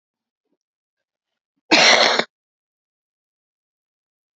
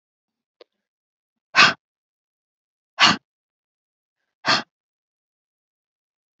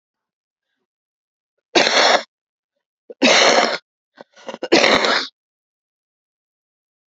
{"cough_length": "4.4 s", "cough_amplitude": 32636, "cough_signal_mean_std_ratio": 0.26, "exhalation_length": "6.4 s", "exhalation_amplitude": 30299, "exhalation_signal_mean_std_ratio": 0.2, "three_cough_length": "7.1 s", "three_cough_amplitude": 32767, "three_cough_signal_mean_std_ratio": 0.37, "survey_phase": "beta (2021-08-13 to 2022-03-07)", "age": "45-64", "gender": "Female", "wearing_mask": "No", "symptom_cough_any": true, "symptom_runny_or_blocked_nose": true, "symptom_fatigue": true, "symptom_headache": true, "symptom_change_to_sense_of_smell_or_taste": true, "smoker_status": "Never smoked", "respiratory_condition_asthma": false, "respiratory_condition_other": false, "recruitment_source": "Test and Trace", "submission_delay": "1 day", "covid_test_result": "Positive", "covid_test_method": "RT-qPCR", "covid_ct_value": 17.4, "covid_ct_gene": "ORF1ab gene"}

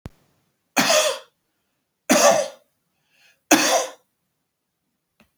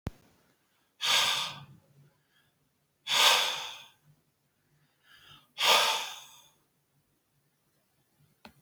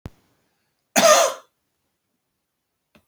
{"three_cough_length": "5.4 s", "three_cough_amplitude": 32767, "three_cough_signal_mean_std_ratio": 0.37, "exhalation_length": "8.6 s", "exhalation_amplitude": 12201, "exhalation_signal_mean_std_ratio": 0.34, "cough_length": "3.1 s", "cough_amplitude": 28494, "cough_signal_mean_std_ratio": 0.28, "survey_phase": "beta (2021-08-13 to 2022-03-07)", "age": "65+", "gender": "Male", "wearing_mask": "No", "symptom_none": true, "smoker_status": "Never smoked", "respiratory_condition_asthma": false, "respiratory_condition_other": false, "recruitment_source": "REACT", "submission_delay": "1 day", "covid_test_result": "Negative", "covid_test_method": "RT-qPCR", "influenza_a_test_result": "Negative", "influenza_b_test_result": "Negative"}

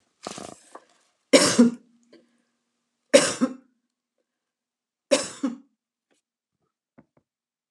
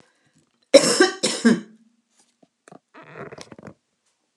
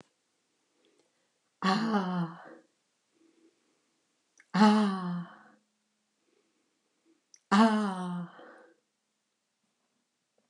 {"three_cough_length": "7.7 s", "three_cough_amplitude": 30947, "three_cough_signal_mean_std_ratio": 0.25, "cough_length": "4.4 s", "cough_amplitude": 32768, "cough_signal_mean_std_ratio": 0.29, "exhalation_length": "10.5 s", "exhalation_amplitude": 11937, "exhalation_signal_mean_std_ratio": 0.33, "survey_phase": "alpha (2021-03-01 to 2021-08-12)", "age": "65+", "gender": "Female", "wearing_mask": "No", "symptom_none": true, "smoker_status": "Never smoked", "respiratory_condition_asthma": false, "respiratory_condition_other": false, "recruitment_source": "REACT", "submission_delay": "4 days", "covid_test_result": "Negative", "covid_test_method": "RT-qPCR"}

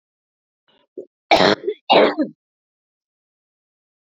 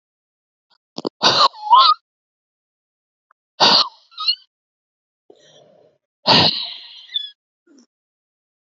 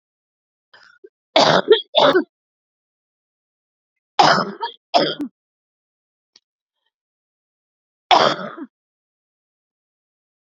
{"cough_length": "4.2 s", "cough_amplitude": 28707, "cough_signal_mean_std_ratio": 0.3, "exhalation_length": "8.6 s", "exhalation_amplitude": 32768, "exhalation_signal_mean_std_ratio": 0.32, "three_cough_length": "10.5 s", "three_cough_amplitude": 32768, "three_cough_signal_mean_std_ratio": 0.29, "survey_phase": "beta (2021-08-13 to 2022-03-07)", "age": "45-64", "gender": "Female", "wearing_mask": "No", "symptom_cough_any": true, "symptom_runny_or_blocked_nose": true, "symptom_shortness_of_breath": true, "symptom_sore_throat": true, "symptom_fatigue": true, "symptom_fever_high_temperature": true, "symptom_headache": true, "symptom_onset": "6 days", "smoker_status": "Never smoked", "respiratory_condition_asthma": false, "respiratory_condition_other": false, "recruitment_source": "Test and Trace", "submission_delay": "2 days", "covid_test_result": "Positive", "covid_test_method": "LAMP"}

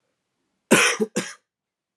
{"cough_length": "2.0 s", "cough_amplitude": 26868, "cough_signal_mean_std_ratio": 0.34, "survey_phase": "alpha (2021-03-01 to 2021-08-12)", "age": "18-44", "gender": "Male", "wearing_mask": "No", "symptom_cough_any": true, "symptom_fatigue": true, "symptom_onset": "6 days", "smoker_status": "Never smoked", "respiratory_condition_asthma": false, "respiratory_condition_other": false, "recruitment_source": "Test and Trace", "submission_delay": "3 days", "covid_test_result": "Positive", "covid_test_method": "RT-qPCR"}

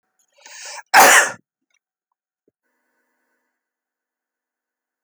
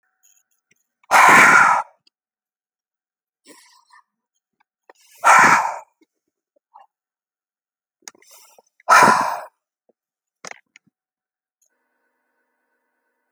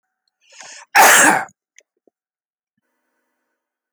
{"cough_length": "5.0 s", "cough_amplitude": 30726, "cough_signal_mean_std_ratio": 0.22, "exhalation_length": "13.3 s", "exhalation_amplitude": 31546, "exhalation_signal_mean_std_ratio": 0.28, "three_cough_length": "3.9 s", "three_cough_amplitude": 32768, "three_cough_signal_mean_std_ratio": 0.29, "survey_phase": "alpha (2021-03-01 to 2021-08-12)", "age": "45-64", "gender": "Male", "wearing_mask": "No", "symptom_none": true, "symptom_onset": "12 days", "smoker_status": "Never smoked", "respiratory_condition_asthma": false, "respiratory_condition_other": false, "recruitment_source": "REACT", "submission_delay": "2 days", "covid_test_result": "Negative", "covid_test_method": "RT-qPCR"}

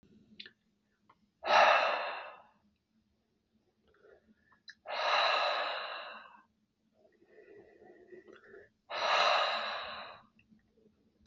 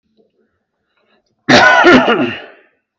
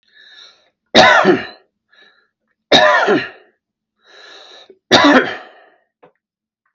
{"exhalation_length": "11.3 s", "exhalation_amplitude": 7630, "exhalation_signal_mean_std_ratio": 0.4, "cough_length": "3.0 s", "cough_amplitude": 32768, "cough_signal_mean_std_ratio": 0.46, "three_cough_length": "6.7 s", "three_cough_amplitude": 32768, "three_cough_signal_mean_std_ratio": 0.38, "survey_phase": "beta (2021-08-13 to 2022-03-07)", "age": "45-64", "gender": "Male", "wearing_mask": "No", "symptom_none": true, "smoker_status": "Never smoked", "respiratory_condition_asthma": false, "respiratory_condition_other": false, "recruitment_source": "REACT", "submission_delay": "2 days", "covid_test_result": "Negative", "covid_test_method": "RT-qPCR", "influenza_a_test_result": "Negative", "influenza_b_test_result": "Negative"}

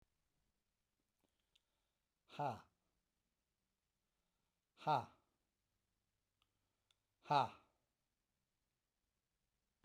{"exhalation_length": "9.8 s", "exhalation_amplitude": 2329, "exhalation_signal_mean_std_ratio": 0.18, "survey_phase": "beta (2021-08-13 to 2022-03-07)", "age": "45-64", "gender": "Male", "wearing_mask": "No", "symptom_none": true, "smoker_status": "Never smoked", "respiratory_condition_asthma": false, "respiratory_condition_other": true, "recruitment_source": "REACT", "submission_delay": "1 day", "covid_test_result": "Negative", "covid_test_method": "RT-qPCR"}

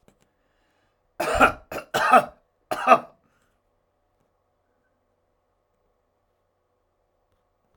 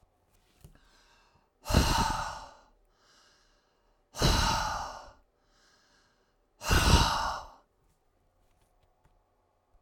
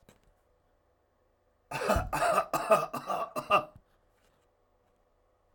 {"three_cough_length": "7.8 s", "three_cough_amplitude": 27580, "three_cough_signal_mean_std_ratio": 0.24, "exhalation_length": "9.8 s", "exhalation_amplitude": 12485, "exhalation_signal_mean_std_ratio": 0.37, "cough_length": "5.5 s", "cough_amplitude": 10228, "cough_signal_mean_std_ratio": 0.39, "survey_phase": "alpha (2021-03-01 to 2021-08-12)", "age": "65+", "gender": "Male", "wearing_mask": "No", "symptom_cough_any": true, "smoker_status": "Ex-smoker", "respiratory_condition_asthma": false, "respiratory_condition_other": false, "recruitment_source": "REACT", "submission_delay": "0 days", "covid_test_result": "Negative", "covid_test_method": "RT-qPCR"}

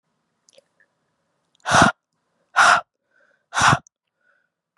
{"exhalation_length": "4.8 s", "exhalation_amplitude": 30082, "exhalation_signal_mean_std_ratio": 0.3, "survey_phase": "beta (2021-08-13 to 2022-03-07)", "age": "18-44", "gender": "Female", "wearing_mask": "No", "symptom_cough_any": true, "symptom_new_continuous_cough": true, "symptom_runny_or_blocked_nose": true, "symptom_shortness_of_breath": true, "symptom_sore_throat": true, "symptom_fatigue": true, "symptom_fever_high_temperature": true, "symptom_headache": true, "symptom_onset": "2 days", "smoker_status": "Never smoked", "respiratory_condition_asthma": false, "respiratory_condition_other": false, "recruitment_source": "Test and Trace", "submission_delay": "2 days", "covid_test_result": "Positive", "covid_test_method": "ePCR"}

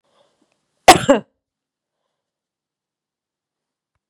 {"cough_length": "4.1 s", "cough_amplitude": 32768, "cough_signal_mean_std_ratio": 0.16, "survey_phase": "beta (2021-08-13 to 2022-03-07)", "age": "45-64", "gender": "Female", "wearing_mask": "No", "symptom_runny_or_blocked_nose": true, "smoker_status": "Never smoked", "respiratory_condition_asthma": false, "respiratory_condition_other": false, "recruitment_source": "Test and Trace", "submission_delay": "1 day", "covid_test_result": "Positive", "covid_test_method": "RT-qPCR", "covid_ct_value": 20.8, "covid_ct_gene": "ORF1ab gene"}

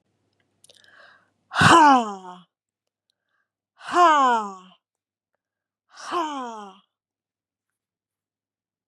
{"exhalation_length": "8.9 s", "exhalation_amplitude": 27857, "exhalation_signal_mean_std_ratio": 0.31, "survey_phase": "beta (2021-08-13 to 2022-03-07)", "age": "45-64", "gender": "Female", "wearing_mask": "No", "symptom_none": true, "smoker_status": "Never smoked", "respiratory_condition_asthma": false, "respiratory_condition_other": false, "recruitment_source": "Test and Trace", "submission_delay": "1 day", "covid_test_result": "Positive", "covid_test_method": "ePCR"}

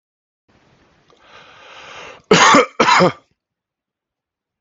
{"cough_length": "4.6 s", "cough_amplitude": 32768, "cough_signal_mean_std_ratio": 0.33, "survey_phase": "beta (2021-08-13 to 2022-03-07)", "age": "18-44", "gender": "Male", "wearing_mask": "No", "symptom_none": true, "smoker_status": "Ex-smoker", "respiratory_condition_asthma": false, "respiratory_condition_other": false, "recruitment_source": "REACT", "submission_delay": "1 day", "covid_test_result": "Negative", "covid_test_method": "RT-qPCR", "influenza_a_test_result": "Negative", "influenza_b_test_result": "Negative"}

